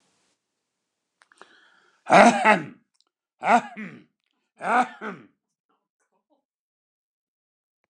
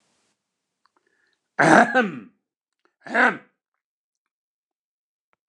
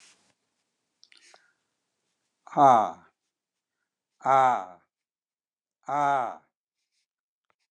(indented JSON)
{
  "three_cough_length": "7.9 s",
  "three_cough_amplitude": 29203,
  "three_cough_signal_mean_std_ratio": 0.25,
  "cough_length": "5.5 s",
  "cough_amplitude": 29203,
  "cough_signal_mean_std_ratio": 0.27,
  "exhalation_length": "7.7 s",
  "exhalation_amplitude": 16478,
  "exhalation_signal_mean_std_ratio": 0.27,
  "survey_phase": "beta (2021-08-13 to 2022-03-07)",
  "age": "65+",
  "gender": "Male",
  "wearing_mask": "No",
  "symptom_none": true,
  "symptom_onset": "13 days",
  "smoker_status": "Never smoked",
  "respiratory_condition_asthma": false,
  "respiratory_condition_other": false,
  "recruitment_source": "REACT",
  "submission_delay": "4 days",
  "covid_test_result": "Negative",
  "covid_test_method": "RT-qPCR"
}